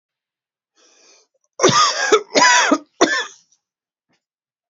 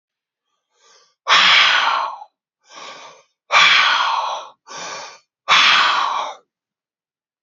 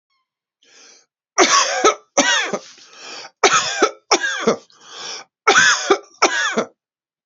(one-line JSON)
{"cough_length": "4.7 s", "cough_amplitude": 32768, "cough_signal_mean_std_ratio": 0.41, "exhalation_length": "7.4 s", "exhalation_amplitude": 31803, "exhalation_signal_mean_std_ratio": 0.5, "three_cough_length": "7.3 s", "three_cough_amplitude": 32319, "three_cough_signal_mean_std_ratio": 0.49, "survey_phase": "beta (2021-08-13 to 2022-03-07)", "age": "45-64", "gender": "Male", "wearing_mask": "No", "symptom_cough_any": true, "symptom_sore_throat": true, "symptom_onset": "12 days", "smoker_status": "Never smoked", "respiratory_condition_asthma": false, "respiratory_condition_other": false, "recruitment_source": "REACT", "submission_delay": "1 day", "covid_test_method": "RT-qPCR"}